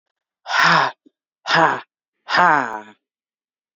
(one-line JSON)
{"exhalation_length": "3.8 s", "exhalation_amplitude": 28369, "exhalation_signal_mean_std_ratio": 0.43, "survey_phase": "beta (2021-08-13 to 2022-03-07)", "age": "45-64", "gender": "Female", "wearing_mask": "No", "symptom_sore_throat": true, "symptom_fatigue": true, "symptom_fever_high_temperature": true, "symptom_onset": "2 days", "smoker_status": "Never smoked", "respiratory_condition_asthma": false, "respiratory_condition_other": false, "recruitment_source": "Test and Trace", "submission_delay": "1 day", "covid_test_result": "Positive", "covid_test_method": "ePCR"}